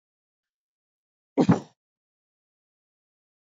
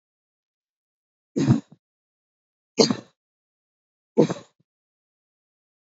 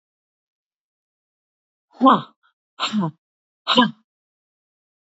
{"cough_length": "3.5 s", "cough_amplitude": 14607, "cough_signal_mean_std_ratio": 0.17, "three_cough_length": "6.0 s", "three_cough_amplitude": 28311, "three_cough_signal_mean_std_ratio": 0.21, "exhalation_length": "5.0 s", "exhalation_amplitude": 27460, "exhalation_signal_mean_std_ratio": 0.27, "survey_phase": "beta (2021-08-13 to 2022-03-07)", "age": "65+", "gender": "Female", "wearing_mask": "No", "symptom_none": true, "smoker_status": "Never smoked", "respiratory_condition_asthma": false, "respiratory_condition_other": false, "recruitment_source": "REACT", "submission_delay": "2 days", "covid_test_result": "Negative", "covid_test_method": "RT-qPCR", "influenza_a_test_result": "Negative", "influenza_b_test_result": "Negative"}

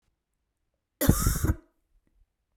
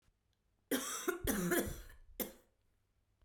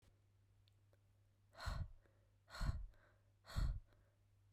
{"cough_length": "2.6 s", "cough_amplitude": 18166, "cough_signal_mean_std_ratio": 0.33, "three_cough_length": "3.2 s", "three_cough_amplitude": 3058, "three_cough_signal_mean_std_ratio": 0.49, "exhalation_length": "4.5 s", "exhalation_amplitude": 1305, "exhalation_signal_mean_std_ratio": 0.4, "survey_phase": "beta (2021-08-13 to 2022-03-07)", "age": "18-44", "gender": "Female", "wearing_mask": "No", "symptom_cough_any": true, "symptom_new_continuous_cough": true, "symptom_shortness_of_breath": true, "symptom_fatigue": true, "symptom_other": true, "symptom_onset": "3 days", "smoker_status": "Ex-smoker", "respiratory_condition_asthma": false, "respiratory_condition_other": false, "recruitment_source": "Test and Trace", "submission_delay": "2 days", "covid_test_result": "Positive", "covid_test_method": "RT-qPCR", "covid_ct_value": 25.5, "covid_ct_gene": "N gene"}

